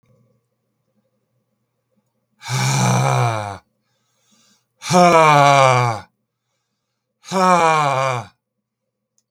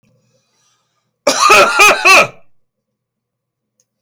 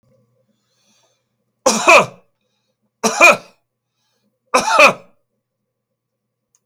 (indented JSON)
{
  "exhalation_length": "9.3 s",
  "exhalation_amplitude": 32768,
  "exhalation_signal_mean_std_ratio": 0.44,
  "cough_length": "4.0 s",
  "cough_amplitude": 32768,
  "cough_signal_mean_std_ratio": 0.42,
  "three_cough_length": "6.7 s",
  "three_cough_amplitude": 32768,
  "three_cough_signal_mean_std_ratio": 0.3,
  "survey_phase": "beta (2021-08-13 to 2022-03-07)",
  "age": "65+",
  "gender": "Male",
  "wearing_mask": "No",
  "symptom_none": true,
  "smoker_status": "Never smoked",
  "respiratory_condition_asthma": false,
  "respiratory_condition_other": false,
  "recruitment_source": "REACT",
  "submission_delay": "4 days",
  "covid_test_result": "Negative",
  "covid_test_method": "RT-qPCR",
  "influenza_a_test_result": "Negative",
  "influenza_b_test_result": "Negative"
}